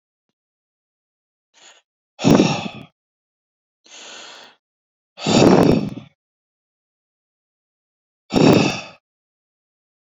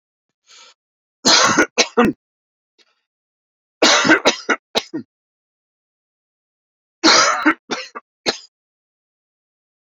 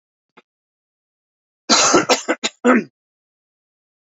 {"exhalation_length": "10.2 s", "exhalation_amplitude": 28298, "exhalation_signal_mean_std_ratio": 0.3, "three_cough_length": "10.0 s", "three_cough_amplitude": 32768, "three_cough_signal_mean_std_ratio": 0.34, "cough_length": "4.0 s", "cough_amplitude": 30801, "cough_signal_mean_std_ratio": 0.34, "survey_phase": "beta (2021-08-13 to 2022-03-07)", "age": "45-64", "gender": "Male", "wearing_mask": "No", "symptom_diarrhoea": true, "symptom_onset": "12 days", "smoker_status": "Ex-smoker", "respiratory_condition_asthma": false, "respiratory_condition_other": false, "recruitment_source": "REACT", "submission_delay": "1 day", "covid_test_result": "Negative", "covid_test_method": "RT-qPCR"}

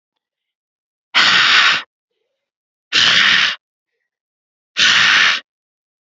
{"exhalation_length": "6.1 s", "exhalation_amplitude": 32767, "exhalation_signal_mean_std_ratio": 0.47, "survey_phase": "alpha (2021-03-01 to 2021-08-12)", "age": "18-44", "gender": "Female", "wearing_mask": "No", "symptom_none": true, "smoker_status": "Never smoked", "respiratory_condition_asthma": false, "respiratory_condition_other": false, "recruitment_source": "REACT", "submission_delay": "2 days", "covid_test_result": "Negative", "covid_test_method": "RT-qPCR"}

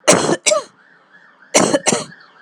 {"cough_length": "2.4 s", "cough_amplitude": 32768, "cough_signal_mean_std_ratio": 0.48, "survey_phase": "alpha (2021-03-01 to 2021-08-12)", "age": "45-64", "gender": "Female", "wearing_mask": "No", "symptom_fatigue": true, "symptom_headache": true, "smoker_status": "Never smoked", "respiratory_condition_asthma": false, "respiratory_condition_other": false, "recruitment_source": "Test and Trace", "submission_delay": "0 days", "covid_test_result": "Positive", "covid_test_method": "LFT"}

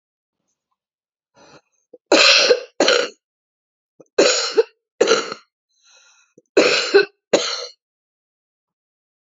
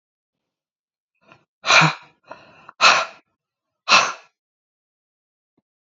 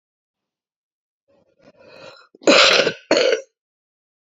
{"three_cough_length": "9.3 s", "three_cough_amplitude": 30291, "three_cough_signal_mean_std_ratio": 0.36, "exhalation_length": "5.8 s", "exhalation_amplitude": 30112, "exhalation_signal_mean_std_ratio": 0.27, "cough_length": "4.4 s", "cough_amplitude": 32767, "cough_signal_mean_std_ratio": 0.33, "survey_phase": "beta (2021-08-13 to 2022-03-07)", "age": "45-64", "gender": "Female", "wearing_mask": "No", "symptom_cough_any": true, "symptom_runny_or_blocked_nose": true, "symptom_sore_throat": true, "symptom_fatigue": true, "symptom_other": true, "symptom_onset": "2 days", "smoker_status": "Current smoker (1 to 10 cigarettes per day)", "respiratory_condition_asthma": false, "respiratory_condition_other": true, "recruitment_source": "Test and Trace", "submission_delay": "1 day", "covid_test_result": "Negative", "covid_test_method": "RT-qPCR"}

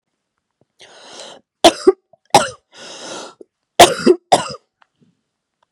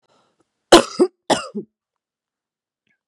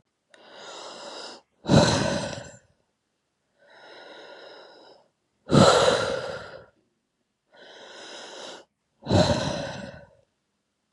{"three_cough_length": "5.7 s", "three_cough_amplitude": 32768, "three_cough_signal_mean_std_ratio": 0.27, "cough_length": "3.1 s", "cough_amplitude": 32768, "cough_signal_mean_std_ratio": 0.23, "exhalation_length": "10.9 s", "exhalation_amplitude": 23205, "exhalation_signal_mean_std_ratio": 0.36, "survey_phase": "beta (2021-08-13 to 2022-03-07)", "age": "18-44", "gender": "Female", "wearing_mask": "No", "symptom_cough_any": true, "symptom_runny_or_blocked_nose": true, "symptom_shortness_of_breath": true, "symptom_headache": true, "symptom_onset": "3 days", "smoker_status": "Current smoker (e-cigarettes or vapes only)", "respiratory_condition_asthma": false, "respiratory_condition_other": false, "recruitment_source": "Test and Trace", "submission_delay": "1 day", "covid_test_result": "Positive", "covid_test_method": "RT-qPCR", "covid_ct_value": 17.1, "covid_ct_gene": "N gene"}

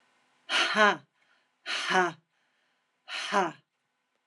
{"exhalation_length": "4.3 s", "exhalation_amplitude": 11550, "exhalation_signal_mean_std_ratio": 0.41, "survey_phase": "beta (2021-08-13 to 2022-03-07)", "age": "65+", "gender": "Female", "wearing_mask": "No", "symptom_none": true, "smoker_status": "Ex-smoker", "respiratory_condition_asthma": false, "respiratory_condition_other": false, "recruitment_source": "REACT", "submission_delay": "2 days", "covid_test_result": "Negative", "covid_test_method": "RT-qPCR", "influenza_a_test_result": "Negative", "influenza_b_test_result": "Negative"}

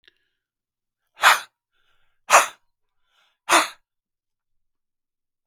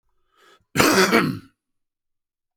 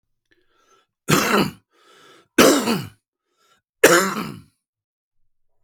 {"exhalation_length": "5.5 s", "exhalation_amplitude": 32766, "exhalation_signal_mean_std_ratio": 0.22, "cough_length": "2.6 s", "cough_amplitude": 32768, "cough_signal_mean_std_ratio": 0.38, "three_cough_length": "5.6 s", "three_cough_amplitude": 32768, "three_cough_signal_mean_std_ratio": 0.35, "survey_phase": "beta (2021-08-13 to 2022-03-07)", "age": "45-64", "gender": "Male", "wearing_mask": "No", "symptom_cough_any": true, "symptom_runny_or_blocked_nose": true, "symptom_fatigue": true, "smoker_status": "Ex-smoker", "respiratory_condition_asthma": false, "respiratory_condition_other": false, "recruitment_source": "Test and Trace", "submission_delay": "1 day", "covid_test_result": "Positive", "covid_test_method": "RT-qPCR"}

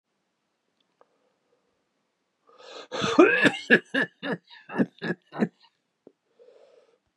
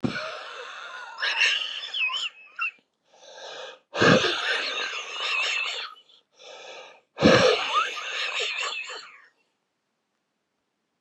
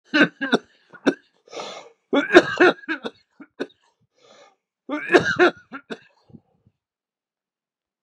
{"cough_length": "7.2 s", "cough_amplitude": 21591, "cough_signal_mean_std_ratio": 0.3, "exhalation_length": "11.0 s", "exhalation_amplitude": 20038, "exhalation_signal_mean_std_ratio": 0.53, "three_cough_length": "8.0 s", "three_cough_amplitude": 32768, "three_cough_signal_mean_std_ratio": 0.31, "survey_phase": "beta (2021-08-13 to 2022-03-07)", "age": "65+", "gender": "Male", "wearing_mask": "No", "symptom_none": true, "symptom_onset": "12 days", "smoker_status": "Ex-smoker", "respiratory_condition_asthma": false, "respiratory_condition_other": true, "recruitment_source": "REACT", "submission_delay": "3 days", "covid_test_result": "Negative", "covid_test_method": "RT-qPCR", "influenza_a_test_result": "Negative", "influenza_b_test_result": "Negative"}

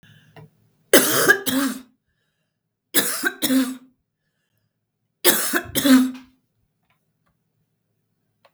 {"three_cough_length": "8.5 s", "three_cough_amplitude": 32768, "three_cough_signal_mean_std_ratio": 0.37, "survey_phase": "beta (2021-08-13 to 2022-03-07)", "age": "65+", "gender": "Female", "wearing_mask": "No", "symptom_none": true, "smoker_status": "Ex-smoker", "respiratory_condition_asthma": false, "respiratory_condition_other": false, "recruitment_source": "REACT", "submission_delay": "2 days", "covid_test_result": "Negative", "covid_test_method": "RT-qPCR", "influenza_a_test_result": "Negative", "influenza_b_test_result": "Negative"}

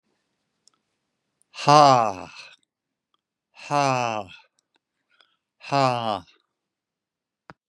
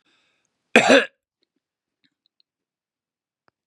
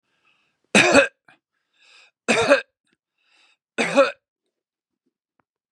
{"exhalation_length": "7.7 s", "exhalation_amplitude": 28139, "exhalation_signal_mean_std_ratio": 0.27, "cough_length": "3.7 s", "cough_amplitude": 32767, "cough_signal_mean_std_ratio": 0.2, "three_cough_length": "5.7 s", "three_cough_amplitude": 31496, "three_cough_signal_mean_std_ratio": 0.3, "survey_phase": "beta (2021-08-13 to 2022-03-07)", "age": "65+", "gender": "Male", "wearing_mask": "No", "symptom_none": true, "smoker_status": "Never smoked", "respiratory_condition_asthma": false, "respiratory_condition_other": false, "recruitment_source": "REACT", "submission_delay": "1 day", "covid_test_result": "Negative", "covid_test_method": "RT-qPCR", "influenza_a_test_result": "Unknown/Void", "influenza_b_test_result": "Unknown/Void"}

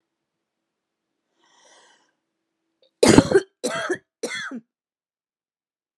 {"three_cough_length": "6.0 s", "three_cough_amplitude": 32768, "three_cough_signal_mean_std_ratio": 0.23, "survey_phase": "alpha (2021-03-01 to 2021-08-12)", "age": "45-64", "gender": "Female", "wearing_mask": "No", "symptom_cough_any": true, "smoker_status": "Never smoked", "respiratory_condition_asthma": false, "respiratory_condition_other": false, "recruitment_source": "REACT", "submission_delay": "1 day", "covid_test_result": "Negative", "covid_test_method": "RT-qPCR"}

